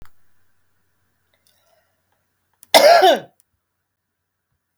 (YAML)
cough_length: 4.8 s
cough_amplitude: 32700
cough_signal_mean_std_ratio: 0.26
survey_phase: alpha (2021-03-01 to 2021-08-12)
age: 45-64
gender: Female
wearing_mask: 'No'
symptom_none: true
smoker_status: Current smoker (1 to 10 cigarettes per day)
respiratory_condition_asthma: false
respiratory_condition_other: false
recruitment_source: REACT
submission_delay: 2 days
covid_test_method: RT-qPCR